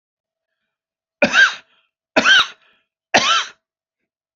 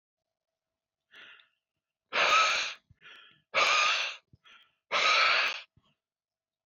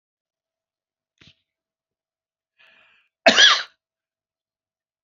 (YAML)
three_cough_length: 4.4 s
three_cough_amplitude: 32768
three_cough_signal_mean_std_ratio: 0.35
exhalation_length: 6.7 s
exhalation_amplitude: 7370
exhalation_signal_mean_std_ratio: 0.44
cough_length: 5.0 s
cough_amplitude: 29393
cough_signal_mean_std_ratio: 0.19
survey_phase: beta (2021-08-13 to 2022-03-07)
age: 45-64
gender: Male
wearing_mask: 'No'
symptom_none: true
smoker_status: Ex-smoker
respiratory_condition_asthma: true
respiratory_condition_other: false
recruitment_source: REACT
submission_delay: 1 day
covid_test_result: Negative
covid_test_method: RT-qPCR